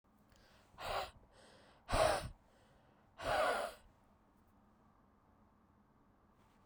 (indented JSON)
{
  "exhalation_length": "6.7 s",
  "exhalation_amplitude": 3094,
  "exhalation_signal_mean_std_ratio": 0.36,
  "survey_phase": "beta (2021-08-13 to 2022-03-07)",
  "age": "18-44",
  "gender": "Female",
  "wearing_mask": "No",
  "symptom_cough_any": true,
  "symptom_shortness_of_breath": true,
  "symptom_fatigue": true,
  "symptom_headache": true,
  "symptom_loss_of_taste": true,
  "symptom_onset": "10 days",
  "smoker_status": "Ex-smoker",
  "respiratory_condition_asthma": false,
  "respiratory_condition_other": false,
  "recruitment_source": "Test and Trace",
  "submission_delay": "3 days",
  "covid_test_result": "Positive",
  "covid_test_method": "RT-qPCR"
}